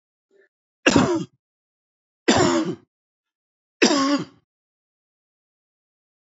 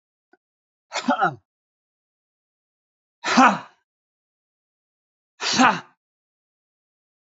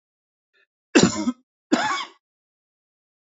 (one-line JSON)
{"three_cough_length": "6.2 s", "three_cough_amplitude": 27445, "three_cough_signal_mean_std_ratio": 0.34, "exhalation_length": "7.3 s", "exhalation_amplitude": 27785, "exhalation_signal_mean_std_ratio": 0.26, "cough_length": "3.3 s", "cough_amplitude": 26395, "cough_signal_mean_std_ratio": 0.31, "survey_phase": "beta (2021-08-13 to 2022-03-07)", "age": "65+", "gender": "Male", "wearing_mask": "No", "symptom_cough_any": true, "smoker_status": "Ex-smoker", "respiratory_condition_asthma": false, "respiratory_condition_other": false, "recruitment_source": "REACT", "submission_delay": "3 days", "covid_test_result": "Negative", "covid_test_method": "RT-qPCR"}